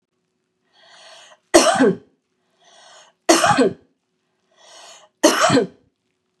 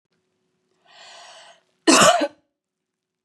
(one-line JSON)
{"three_cough_length": "6.4 s", "three_cough_amplitude": 32768, "three_cough_signal_mean_std_ratio": 0.36, "cough_length": "3.2 s", "cough_amplitude": 30220, "cough_signal_mean_std_ratio": 0.29, "survey_phase": "beta (2021-08-13 to 2022-03-07)", "age": "45-64", "gender": "Female", "wearing_mask": "No", "symptom_none": true, "smoker_status": "Never smoked", "respiratory_condition_asthma": false, "respiratory_condition_other": false, "recruitment_source": "REACT", "submission_delay": "2 days", "covid_test_result": "Negative", "covid_test_method": "RT-qPCR", "influenza_a_test_result": "Negative", "influenza_b_test_result": "Negative"}